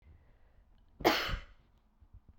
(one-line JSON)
{"cough_length": "2.4 s", "cough_amplitude": 9457, "cough_signal_mean_std_ratio": 0.32, "survey_phase": "beta (2021-08-13 to 2022-03-07)", "age": "18-44", "gender": "Female", "wearing_mask": "No", "symptom_cough_any": true, "symptom_new_continuous_cough": true, "symptom_runny_or_blocked_nose": true, "symptom_sore_throat": true, "symptom_fever_high_temperature": true, "symptom_headache": true, "symptom_onset": "4 days", "smoker_status": "Never smoked", "respiratory_condition_asthma": false, "respiratory_condition_other": false, "recruitment_source": "Test and Trace", "submission_delay": "2 days", "covid_test_result": "Positive", "covid_test_method": "RT-qPCR", "covid_ct_value": 19.1, "covid_ct_gene": "ORF1ab gene"}